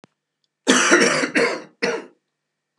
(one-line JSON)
{"cough_length": "2.8 s", "cough_amplitude": 32257, "cough_signal_mean_std_ratio": 0.5, "survey_phase": "beta (2021-08-13 to 2022-03-07)", "age": "45-64", "gender": "Male", "wearing_mask": "No", "symptom_cough_any": true, "symptom_onset": "3 days", "smoker_status": "Ex-smoker", "respiratory_condition_asthma": false, "respiratory_condition_other": false, "recruitment_source": "Test and Trace", "submission_delay": "2 days", "covid_test_result": "Positive", "covid_test_method": "RT-qPCR"}